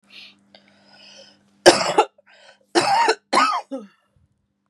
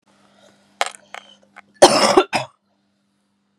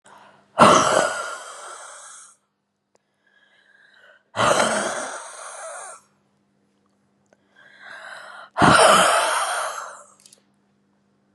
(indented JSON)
{
  "three_cough_length": "4.7 s",
  "three_cough_amplitude": 32768,
  "three_cough_signal_mean_std_ratio": 0.36,
  "cough_length": "3.6 s",
  "cough_amplitude": 32768,
  "cough_signal_mean_std_ratio": 0.28,
  "exhalation_length": "11.3 s",
  "exhalation_amplitude": 32764,
  "exhalation_signal_mean_std_ratio": 0.39,
  "survey_phase": "beta (2021-08-13 to 2022-03-07)",
  "age": "18-44",
  "gender": "Female",
  "wearing_mask": "No",
  "symptom_cough_any": true,
  "symptom_shortness_of_breath": true,
  "symptom_diarrhoea": true,
  "symptom_fever_high_temperature": true,
  "symptom_headache": true,
  "symptom_other": true,
  "smoker_status": "Ex-smoker",
  "respiratory_condition_asthma": false,
  "respiratory_condition_other": false,
  "recruitment_source": "Test and Trace",
  "submission_delay": "1 day",
  "covid_test_result": "Positive",
  "covid_test_method": "RT-qPCR",
  "covid_ct_value": 29.0,
  "covid_ct_gene": "ORF1ab gene",
  "covid_ct_mean": 30.5,
  "covid_viral_load": "100 copies/ml",
  "covid_viral_load_category": "Minimal viral load (< 10K copies/ml)"
}